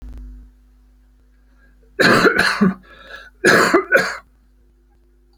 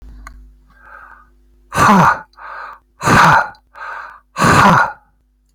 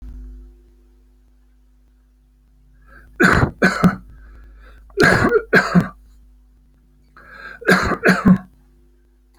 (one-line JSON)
{"cough_length": "5.4 s", "cough_amplitude": 30623, "cough_signal_mean_std_ratio": 0.43, "exhalation_length": "5.5 s", "exhalation_amplitude": 32411, "exhalation_signal_mean_std_ratio": 0.47, "three_cough_length": "9.4 s", "three_cough_amplitude": 32187, "three_cough_signal_mean_std_ratio": 0.39, "survey_phase": "alpha (2021-03-01 to 2021-08-12)", "age": "65+", "gender": "Male", "wearing_mask": "No", "symptom_none": true, "smoker_status": "Never smoked", "respiratory_condition_asthma": false, "respiratory_condition_other": false, "recruitment_source": "REACT", "submission_delay": "6 days", "covid_test_result": "Negative", "covid_test_method": "RT-qPCR"}